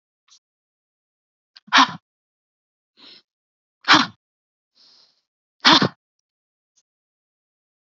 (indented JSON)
{
  "exhalation_length": "7.9 s",
  "exhalation_amplitude": 30663,
  "exhalation_signal_mean_std_ratio": 0.2,
  "survey_phase": "beta (2021-08-13 to 2022-03-07)",
  "age": "45-64",
  "gender": "Female",
  "wearing_mask": "No",
  "symptom_none": true,
  "smoker_status": "Never smoked",
  "respiratory_condition_asthma": false,
  "respiratory_condition_other": false,
  "recruitment_source": "REACT",
  "submission_delay": "1 day",
  "covid_test_result": "Negative",
  "covid_test_method": "RT-qPCR",
  "influenza_a_test_result": "Negative",
  "influenza_b_test_result": "Negative"
}